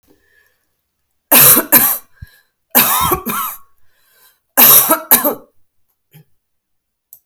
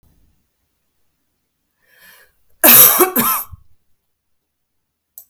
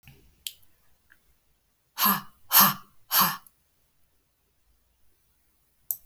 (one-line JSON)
{"three_cough_length": "7.3 s", "three_cough_amplitude": 32768, "three_cough_signal_mean_std_ratio": 0.4, "cough_length": "5.3 s", "cough_amplitude": 32768, "cough_signal_mean_std_ratio": 0.28, "exhalation_length": "6.1 s", "exhalation_amplitude": 22985, "exhalation_signal_mean_std_ratio": 0.26, "survey_phase": "alpha (2021-03-01 to 2021-08-12)", "age": "45-64", "gender": "Female", "wearing_mask": "No", "symptom_none": true, "smoker_status": "Ex-smoker", "respiratory_condition_asthma": false, "respiratory_condition_other": false, "recruitment_source": "REACT", "submission_delay": "1 day", "covid_test_result": "Negative", "covid_test_method": "RT-qPCR"}